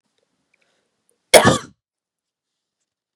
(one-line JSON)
{"cough_length": "3.2 s", "cough_amplitude": 32768, "cough_signal_mean_std_ratio": 0.2, "survey_phase": "beta (2021-08-13 to 2022-03-07)", "age": "18-44", "gender": "Female", "wearing_mask": "No", "symptom_runny_or_blocked_nose": true, "symptom_sore_throat": true, "symptom_headache": true, "symptom_onset": "3 days", "smoker_status": "Never smoked", "respiratory_condition_asthma": false, "respiratory_condition_other": false, "recruitment_source": "Test and Trace", "submission_delay": "2 days", "covid_test_result": "Positive", "covid_test_method": "RT-qPCR"}